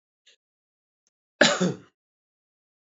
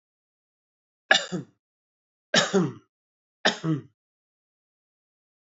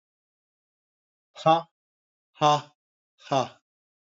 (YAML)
cough_length: 2.8 s
cough_amplitude: 26166
cough_signal_mean_std_ratio: 0.23
three_cough_length: 5.5 s
three_cough_amplitude: 26090
three_cough_signal_mean_std_ratio: 0.28
exhalation_length: 4.0 s
exhalation_amplitude: 17271
exhalation_signal_mean_std_ratio: 0.26
survey_phase: beta (2021-08-13 to 2022-03-07)
age: 65+
gender: Male
wearing_mask: 'No'
symptom_none: true
smoker_status: Ex-smoker
respiratory_condition_asthma: false
respiratory_condition_other: false
recruitment_source: REACT
submission_delay: 2 days
covid_test_result: Negative
covid_test_method: RT-qPCR
influenza_a_test_result: Negative
influenza_b_test_result: Negative